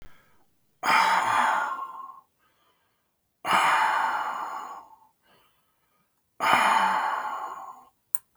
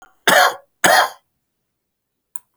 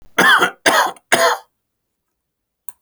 {"exhalation_length": "8.4 s", "exhalation_amplitude": 29486, "exhalation_signal_mean_std_ratio": 0.54, "three_cough_length": "2.6 s", "three_cough_amplitude": 32767, "three_cough_signal_mean_std_ratio": 0.36, "cough_length": "2.8 s", "cough_amplitude": 30084, "cough_signal_mean_std_ratio": 0.45, "survey_phase": "alpha (2021-03-01 to 2021-08-12)", "age": "65+", "gender": "Male", "wearing_mask": "No", "symptom_none": true, "smoker_status": "Never smoked", "respiratory_condition_asthma": false, "respiratory_condition_other": false, "recruitment_source": "REACT", "submission_delay": "1 day", "covid_test_result": "Negative", "covid_test_method": "RT-qPCR"}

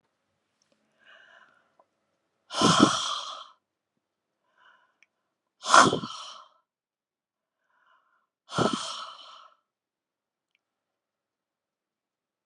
{"exhalation_length": "12.5 s", "exhalation_amplitude": 26119, "exhalation_signal_mean_std_ratio": 0.23, "survey_phase": "alpha (2021-03-01 to 2021-08-12)", "age": "65+", "gender": "Female", "wearing_mask": "No", "symptom_none": true, "smoker_status": "Never smoked", "respiratory_condition_asthma": false, "respiratory_condition_other": false, "recruitment_source": "REACT", "submission_delay": "1 day", "covid_test_result": "Negative", "covid_test_method": "RT-qPCR"}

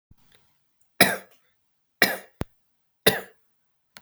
{"three_cough_length": "4.0 s", "three_cough_amplitude": 32767, "three_cough_signal_mean_std_ratio": 0.23, "survey_phase": "beta (2021-08-13 to 2022-03-07)", "age": "45-64", "gender": "Male", "wearing_mask": "No", "symptom_none": true, "smoker_status": "Never smoked", "respiratory_condition_asthma": false, "respiratory_condition_other": false, "recruitment_source": "REACT", "submission_delay": "25 days", "covid_test_result": "Negative", "covid_test_method": "RT-qPCR"}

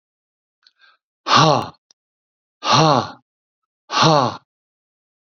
{"exhalation_length": "5.3 s", "exhalation_amplitude": 32768, "exhalation_signal_mean_std_ratio": 0.36, "survey_phase": "beta (2021-08-13 to 2022-03-07)", "age": "45-64", "gender": "Male", "wearing_mask": "No", "symptom_none": true, "smoker_status": "Never smoked", "respiratory_condition_asthma": false, "respiratory_condition_other": false, "recruitment_source": "REACT", "submission_delay": "1 day", "covid_test_result": "Negative", "covid_test_method": "RT-qPCR"}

